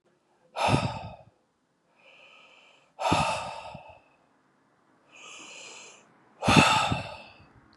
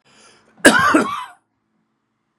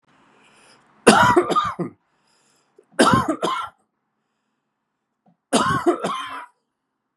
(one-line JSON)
{"exhalation_length": "7.8 s", "exhalation_amplitude": 23871, "exhalation_signal_mean_std_ratio": 0.37, "cough_length": "2.4 s", "cough_amplitude": 32768, "cough_signal_mean_std_ratio": 0.36, "three_cough_length": "7.2 s", "three_cough_amplitude": 32768, "three_cough_signal_mean_std_ratio": 0.39, "survey_phase": "beta (2021-08-13 to 2022-03-07)", "age": "65+", "gender": "Male", "wearing_mask": "No", "symptom_none": true, "smoker_status": "Ex-smoker", "respiratory_condition_asthma": false, "respiratory_condition_other": false, "recruitment_source": "REACT", "submission_delay": "10 days", "covid_test_result": "Negative", "covid_test_method": "RT-qPCR", "influenza_a_test_result": "Negative", "influenza_b_test_result": "Negative"}